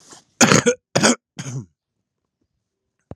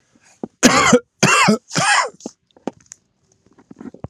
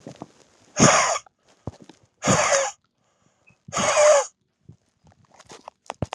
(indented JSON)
{
  "cough_length": "3.2 s",
  "cough_amplitude": 32768,
  "cough_signal_mean_std_ratio": 0.33,
  "three_cough_length": "4.1 s",
  "three_cough_amplitude": 32768,
  "three_cough_signal_mean_std_ratio": 0.43,
  "exhalation_length": "6.1 s",
  "exhalation_amplitude": 28206,
  "exhalation_signal_mean_std_ratio": 0.4,
  "survey_phase": "alpha (2021-03-01 to 2021-08-12)",
  "age": "18-44",
  "gender": "Male",
  "wearing_mask": "No",
  "symptom_cough_any": true,
  "symptom_fatigue": true,
  "symptom_fever_high_temperature": true,
  "symptom_headache": true,
  "smoker_status": "Current smoker (1 to 10 cigarettes per day)",
  "respiratory_condition_asthma": true,
  "respiratory_condition_other": false,
  "recruitment_source": "Test and Trace",
  "submission_delay": "4 days",
  "covid_test_result": "Positive",
  "covid_test_method": "LFT"
}